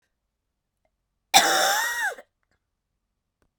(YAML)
cough_length: 3.6 s
cough_amplitude: 29948
cough_signal_mean_std_ratio: 0.35
survey_phase: beta (2021-08-13 to 2022-03-07)
age: 45-64
gender: Female
wearing_mask: 'No'
symptom_cough_any: true
symptom_new_continuous_cough: true
symptom_runny_or_blocked_nose: true
symptom_sore_throat: true
symptom_fatigue: true
symptom_fever_high_temperature: true
symptom_headache: true
symptom_change_to_sense_of_smell_or_taste: true
symptom_loss_of_taste: true
symptom_other: true
symptom_onset: 6 days
smoker_status: Never smoked
respiratory_condition_asthma: false
respiratory_condition_other: false
recruitment_source: Test and Trace
submission_delay: 2 days
covid_test_result: Positive
covid_test_method: RT-qPCR
covid_ct_value: 20.2
covid_ct_gene: ORF1ab gene